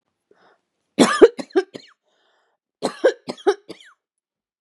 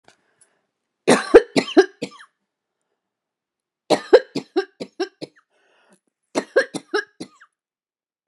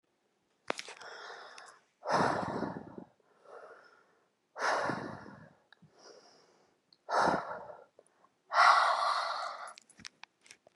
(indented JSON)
{
  "cough_length": "4.6 s",
  "cough_amplitude": 32768,
  "cough_signal_mean_std_ratio": 0.26,
  "three_cough_length": "8.3 s",
  "three_cough_amplitude": 32768,
  "three_cough_signal_mean_std_ratio": 0.24,
  "exhalation_length": "10.8 s",
  "exhalation_amplitude": 9312,
  "exhalation_signal_mean_std_ratio": 0.41,
  "survey_phase": "beta (2021-08-13 to 2022-03-07)",
  "age": "18-44",
  "gender": "Female",
  "wearing_mask": "No",
  "symptom_cough_any": true,
  "symptom_sore_throat": true,
  "symptom_onset": "9 days",
  "smoker_status": "Ex-smoker",
  "respiratory_condition_asthma": false,
  "respiratory_condition_other": false,
  "recruitment_source": "REACT",
  "submission_delay": "2 days",
  "covid_test_result": "Negative",
  "covid_test_method": "RT-qPCR",
  "influenza_a_test_result": "Negative",
  "influenza_b_test_result": "Negative"
}